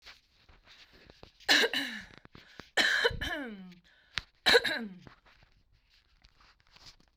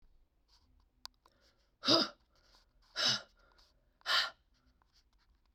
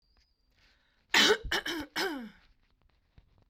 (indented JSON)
{
  "three_cough_length": "7.2 s",
  "three_cough_amplitude": 12262,
  "three_cough_signal_mean_std_ratio": 0.36,
  "exhalation_length": "5.5 s",
  "exhalation_amplitude": 6523,
  "exhalation_signal_mean_std_ratio": 0.28,
  "cough_length": "3.5 s",
  "cough_amplitude": 12000,
  "cough_signal_mean_std_ratio": 0.35,
  "survey_phase": "beta (2021-08-13 to 2022-03-07)",
  "age": "45-64",
  "gender": "Female",
  "wearing_mask": "No",
  "symptom_none": true,
  "smoker_status": "Ex-smoker",
  "respiratory_condition_asthma": false,
  "respiratory_condition_other": false,
  "recruitment_source": "REACT",
  "submission_delay": "0 days",
  "covid_test_result": "Negative",
  "covid_test_method": "RT-qPCR",
  "influenza_a_test_result": "Unknown/Void",
  "influenza_b_test_result": "Unknown/Void"
}